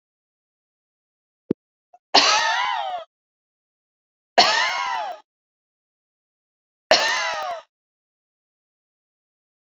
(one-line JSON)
{"three_cough_length": "9.6 s", "three_cough_amplitude": 30560, "three_cough_signal_mean_std_ratio": 0.35, "survey_phase": "beta (2021-08-13 to 2022-03-07)", "age": "45-64", "gender": "Female", "wearing_mask": "No", "symptom_none": true, "smoker_status": "Never smoked", "respiratory_condition_asthma": false, "respiratory_condition_other": false, "recruitment_source": "REACT", "submission_delay": "1 day", "covid_test_result": "Negative", "covid_test_method": "RT-qPCR"}